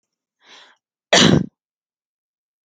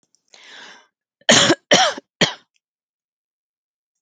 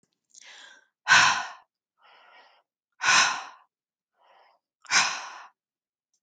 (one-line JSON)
{"cough_length": "2.6 s", "cough_amplitude": 29122, "cough_signal_mean_std_ratio": 0.27, "three_cough_length": "4.0 s", "three_cough_amplitude": 32270, "three_cough_signal_mean_std_ratio": 0.3, "exhalation_length": "6.2 s", "exhalation_amplitude": 18743, "exhalation_signal_mean_std_ratio": 0.32, "survey_phase": "beta (2021-08-13 to 2022-03-07)", "age": "18-44", "gender": "Female", "wearing_mask": "No", "symptom_sore_throat": true, "symptom_fatigue": true, "symptom_onset": "12 days", "smoker_status": "Ex-smoker", "respiratory_condition_asthma": false, "respiratory_condition_other": false, "recruitment_source": "REACT", "submission_delay": "1 day", "covid_test_result": "Negative", "covid_test_method": "RT-qPCR"}